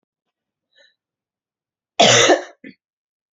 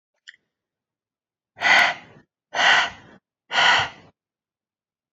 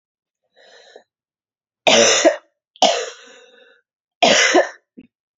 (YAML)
cough_length: 3.3 s
cough_amplitude: 32767
cough_signal_mean_std_ratio: 0.29
exhalation_length: 5.1 s
exhalation_amplitude: 26267
exhalation_signal_mean_std_ratio: 0.37
three_cough_length: 5.4 s
three_cough_amplitude: 32768
three_cough_signal_mean_std_ratio: 0.38
survey_phase: alpha (2021-03-01 to 2021-08-12)
age: 18-44
gender: Female
wearing_mask: 'No'
symptom_cough_any: true
symptom_new_continuous_cough: true
symptom_shortness_of_breath: true
symptom_fatigue: true
symptom_fever_high_temperature: true
symptom_headache: true
symptom_onset: 3 days
smoker_status: Ex-smoker
respiratory_condition_asthma: false
respiratory_condition_other: false
recruitment_source: Test and Trace
submission_delay: 2 days
covid_test_result: Positive
covid_test_method: RT-qPCR
covid_ct_value: 18.4
covid_ct_gene: ORF1ab gene
covid_ct_mean: 19.0
covid_viral_load: 590000 copies/ml
covid_viral_load_category: Low viral load (10K-1M copies/ml)